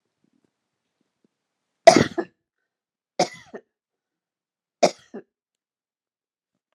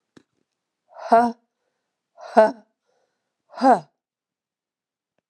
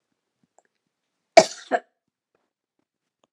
three_cough_length: 6.7 s
three_cough_amplitude: 32768
three_cough_signal_mean_std_ratio: 0.15
exhalation_length: 5.3 s
exhalation_amplitude: 30152
exhalation_signal_mean_std_ratio: 0.25
cough_length: 3.3 s
cough_amplitude: 32768
cough_signal_mean_std_ratio: 0.13
survey_phase: beta (2021-08-13 to 2022-03-07)
age: 45-64
gender: Female
wearing_mask: 'No'
symptom_runny_or_blocked_nose: true
smoker_status: Never smoked
respiratory_condition_asthma: false
respiratory_condition_other: false
recruitment_source: REACT
submission_delay: 2 days
covid_test_result: Negative
covid_test_method: RT-qPCR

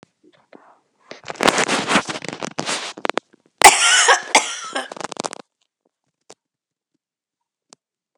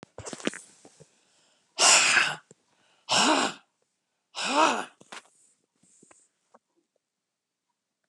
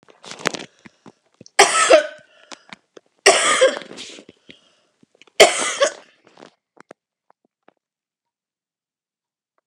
cough_length: 8.2 s
cough_amplitude: 32768
cough_signal_mean_std_ratio: 0.33
exhalation_length: 8.1 s
exhalation_amplitude: 20254
exhalation_signal_mean_std_ratio: 0.34
three_cough_length: 9.7 s
three_cough_amplitude: 32768
three_cough_signal_mean_std_ratio: 0.29
survey_phase: beta (2021-08-13 to 2022-03-07)
age: 65+
gender: Female
wearing_mask: 'No'
symptom_cough_any: true
symptom_runny_or_blocked_nose: true
symptom_fatigue: true
symptom_headache: true
symptom_onset: 4 days
smoker_status: Never smoked
respiratory_condition_asthma: false
respiratory_condition_other: false
recruitment_source: Test and Trace
submission_delay: 1 day
covid_test_result: Positive
covid_test_method: RT-qPCR
covid_ct_value: 16.9
covid_ct_gene: ORF1ab gene
covid_ct_mean: 18.2
covid_viral_load: 1100000 copies/ml
covid_viral_load_category: High viral load (>1M copies/ml)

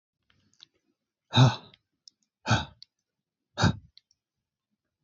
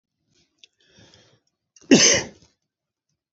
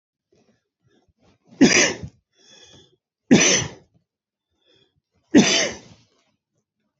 exhalation_length: 5.0 s
exhalation_amplitude: 13820
exhalation_signal_mean_std_ratio: 0.24
cough_length: 3.3 s
cough_amplitude: 29284
cough_signal_mean_std_ratio: 0.24
three_cough_length: 7.0 s
three_cough_amplitude: 28724
three_cough_signal_mean_std_ratio: 0.3
survey_phase: beta (2021-08-13 to 2022-03-07)
age: 45-64
gender: Male
wearing_mask: 'No'
symptom_diarrhoea: true
smoker_status: Never smoked
respiratory_condition_asthma: false
respiratory_condition_other: false
recruitment_source: Test and Trace
submission_delay: 3 days
covid_test_result: Negative
covid_test_method: RT-qPCR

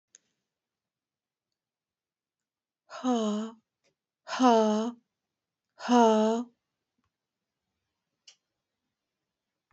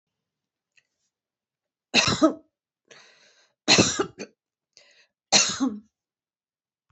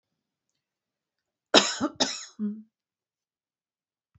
exhalation_length: 9.7 s
exhalation_amplitude: 13239
exhalation_signal_mean_std_ratio: 0.3
three_cough_length: 6.9 s
three_cough_amplitude: 20713
three_cough_signal_mean_std_ratio: 0.3
cough_length: 4.2 s
cough_amplitude: 23742
cough_signal_mean_std_ratio: 0.25
survey_phase: alpha (2021-03-01 to 2021-08-12)
age: 45-64
gender: Female
wearing_mask: 'Yes'
symptom_none: true
smoker_status: Never smoked
respiratory_condition_asthma: false
respiratory_condition_other: false
recruitment_source: REACT
submission_delay: 2 days
covid_test_result: Negative
covid_test_method: RT-qPCR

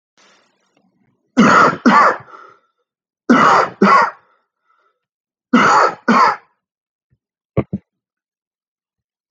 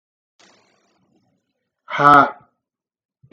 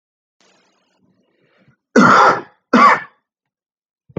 three_cough_length: 9.3 s
three_cough_amplitude: 32768
three_cough_signal_mean_std_ratio: 0.4
exhalation_length: 3.3 s
exhalation_amplitude: 32768
exhalation_signal_mean_std_ratio: 0.25
cough_length: 4.2 s
cough_amplitude: 32768
cough_signal_mean_std_ratio: 0.34
survey_phase: beta (2021-08-13 to 2022-03-07)
age: 18-44
gender: Male
wearing_mask: 'No'
symptom_none: true
smoker_status: Ex-smoker
respiratory_condition_asthma: false
respiratory_condition_other: false
recruitment_source: REACT
submission_delay: 12 days
covid_test_result: Negative
covid_test_method: RT-qPCR
influenza_a_test_result: Negative
influenza_b_test_result: Negative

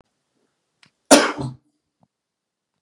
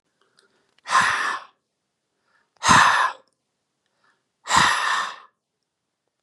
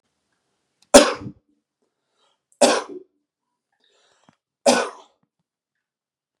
cough_length: 2.8 s
cough_amplitude: 32768
cough_signal_mean_std_ratio: 0.22
exhalation_length: 6.2 s
exhalation_amplitude: 27211
exhalation_signal_mean_std_ratio: 0.39
three_cough_length: 6.4 s
three_cough_amplitude: 32768
three_cough_signal_mean_std_ratio: 0.22
survey_phase: beta (2021-08-13 to 2022-03-07)
age: 18-44
gender: Male
wearing_mask: 'No'
symptom_headache: true
smoker_status: Never smoked
respiratory_condition_asthma: false
respiratory_condition_other: false
recruitment_source: REACT
submission_delay: 2 days
covid_test_result: Negative
covid_test_method: RT-qPCR
influenza_a_test_result: Negative
influenza_b_test_result: Negative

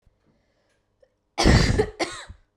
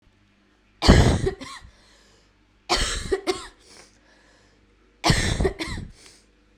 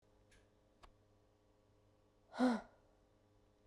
cough_length: 2.6 s
cough_amplitude: 21927
cough_signal_mean_std_ratio: 0.38
three_cough_length: 6.6 s
three_cough_amplitude: 32768
three_cough_signal_mean_std_ratio: 0.38
exhalation_length: 3.7 s
exhalation_amplitude: 2319
exhalation_signal_mean_std_ratio: 0.24
survey_phase: beta (2021-08-13 to 2022-03-07)
age: 18-44
gender: Female
wearing_mask: 'No'
symptom_cough_any: true
symptom_new_continuous_cough: true
symptom_runny_or_blocked_nose: true
symptom_sore_throat: true
symptom_fatigue: true
symptom_onset: 3 days
smoker_status: Never smoked
respiratory_condition_asthma: true
respiratory_condition_other: false
recruitment_source: Test and Trace
submission_delay: 1 day
covid_test_result: Positive
covid_test_method: RT-qPCR
covid_ct_value: 11.4
covid_ct_gene: ORF1ab gene
covid_ct_mean: 11.9
covid_viral_load: 130000000 copies/ml
covid_viral_load_category: High viral load (>1M copies/ml)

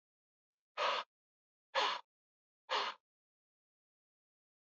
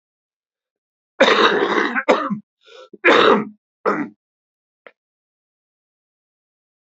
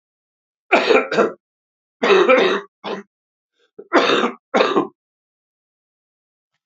exhalation_length: 4.8 s
exhalation_amplitude: 2910
exhalation_signal_mean_std_ratio: 0.31
cough_length: 6.9 s
cough_amplitude: 30871
cough_signal_mean_std_ratio: 0.38
three_cough_length: 6.7 s
three_cough_amplitude: 32554
three_cough_signal_mean_std_ratio: 0.43
survey_phase: beta (2021-08-13 to 2022-03-07)
age: 45-64
gender: Male
wearing_mask: 'No'
symptom_cough_any: true
symptom_onset: 4 days
smoker_status: Never smoked
respiratory_condition_asthma: true
respiratory_condition_other: false
recruitment_source: Test and Trace
submission_delay: 3 days
covid_test_result: Positive
covid_test_method: RT-qPCR
covid_ct_value: 20.6
covid_ct_gene: N gene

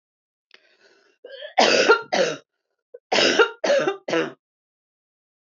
cough_length: 5.5 s
cough_amplitude: 23774
cough_signal_mean_std_ratio: 0.43
survey_phase: beta (2021-08-13 to 2022-03-07)
age: 45-64
gender: Female
wearing_mask: 'No'
symptom_none: true
smoker_status: Never smoked
respiratory_condition_asthma: false
respiratory_condition_other: false
recruitment_source: REACT
submission_delay: 2 days
covid_test_result: Negative
covid_test_method: RT-qPCR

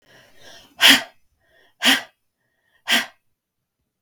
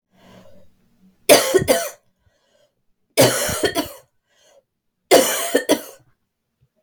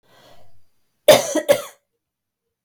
exhalation_length: 4.0 s
exhalation_amplitude: 32768
exhalation_signal_mean_std_ratio: 0.28
three_cough_length: 6.8 s
three_cough_amplitude: 32768
three_cough_signal_mean_std_ratio: 0.37
cough_length: 2.6 s
cough_amplitude: 32768
cough_signal_mean_std_ratio: 0.28
survey_phase: beta (2021-08-13 to 2022-03-07)
age: 45-64
gender: Female
wearing_mask: 'No'
symptom_cough_any: true
symptom_runny_or_blocked_nose: true
symptom_fatigue: true
symptom_onset: 4 days
smoker_status: Never smoked
respiratory_condition_asthma: false
respiratory_condition_other: false
recruitment_source: Test and Trace
submission_delay: 2 days
covid_test_result: Positive
covid_test_method: RT-qPCR
covid_ct_value: 23.0
covid_ct_gene: N gene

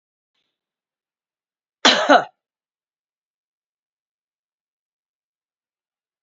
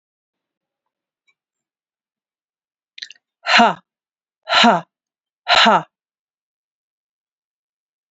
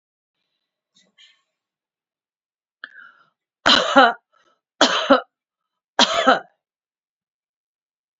cough_length: 6.2 s
cough_amplitude: 31467
cough_signal_mean_std_ratio: 0.17
exhalation_length: 8.1 s
exhalation_amplitude: 31190
exhalation_signal_mean_std_ratio: 0.26
three_cough_length: 8.2 s
three_cough_amplitude: 29607
three_cough_signal_mean_std_ratio: 0.27
survey_phase: beta (2021-08-13 to 2022-03-07)
age: 65+
gender: Female
wearing_mask: 'No'
symptom_none: true
smoker_status: Ex-smoker
respiratory_condition_asthma: true
respiratory_condition_other: true
recruitment_source: Test and Trace
submission_delay: 1 day
covid_test_result: Negative
covid_test_method: RT-qPCR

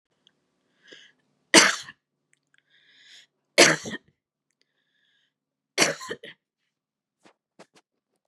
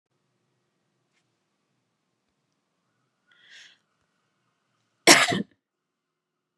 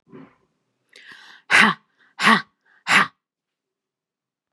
three_cough_length: 8.3 s
three_cough_amplitude: 32767
three_cough_signal_mean_std_ratio: 0.2
cough_length: 6.6 s
cough_amplitude: 31402
cough_signal_mean_std_ratio: 0.15
exhalation_length: 4.5 s
exhalation_amplitude: 30663
exhalation_signal_mean_std_ratio: 0.3
survey_phase: beta (2021-08-13 to 2022-03-07)
age: 45-64
gender: Female
wearing_mask: 'No'
symptom_runny_or_blocked_nose: true
symptom_sore_throat: true
symptom_fatigue: true
symptom_onset: 4 days
smoker_status: Ex-smoker
respiratory_condition_asthma: false
respiratory_condition_other: false
recruitment_source: Test and Trace
submission_delay: 1 day
covid_test_result: Positive
covid_test_method: RT-qPCR
covid_ct_value: 15.9
covid_ct_gene: ORF1ab gene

